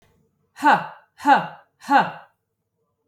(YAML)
exhalation_length: 3.1 s
exhalation_amplitude: 22492
exhalation_signal_mean_std_ratio: 0.36
survey_phase: alpha (2021-03-01 to 2021-08-12)
age: 18-44
gender: Female
wearing_mask: 'No'
symptom_none: true
smoker_status: Never smoked
respiratory_condition_asthma: false
respiratory_condition_other: false
recruitment_source: REACT
submission_delay: 2 days
covid_test_result: Negative
covid_test_method: RT-qPCR